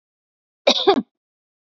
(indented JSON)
{
  "cough_length": "1.7 s",
  "cough_amplitude": 27083,
  "cough_signal_mean_std_ratio": 0.3,
  "survey_phase": "beta (2021-08-13 to 2022-03-07)",
  "age": "45-64",
  "gender": "Female",
  "wearing_mask": "No",
  "symptom_none": true,
  "smoker_status": "Never smoked",
  "respiratory_condition_asthma": false,
  "respiratory_condition_other": false,
  "recruitment_source": "REACT",
  "submission_delay": "1 day",
  "covid_test_result": "Negative",
  "covid_test_method": "RT-qPCR",
  "influenza_a_test_result": "Negative",
  "influenza_b_test_result": "Negative"
}